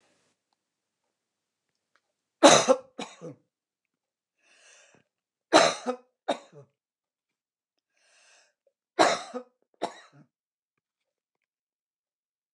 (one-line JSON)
{"three_cough_length": "12.5 s", "three_cough_amplitude": 26914, "three_cough_signal_mean_std_ratio": 0.2, "survey_phase": "alpha (2021-03-01 to 2021-08-12)", "age": "65+", "gender": "Female", "wearing_mask": "No", "symptom_none": true, "smoker_status": "Never smoked", "respiratory_condition_asthma": false, "respiratory_condition_other": false, "recruitment_source": "REACT", "submission_delay": "1 day", "covid_test_result": "Negative", "covid_test_method": "RT-qPCR"}